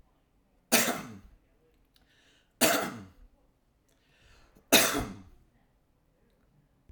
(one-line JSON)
{"three_cough_length": "6.9 s", "three_cough_amplitude": 15571, "three_cough_signal_mean_std_ratio": 0.29, "survey_phase": "alpha (2021-03-01 to 2021-08-12)", "age": "45-64", "gender": "Male", "wearing_mask": "Yes", "symptom_none": true, "smoker_status": "Never smoked", "respiratory_condition_asthma": false, "respiratory_condition_other": false, "recruitment_source": "Test and Trace", "submission_delay": "0 days", "covid_test_result": "Negative", "covid_test_method": "LFT"}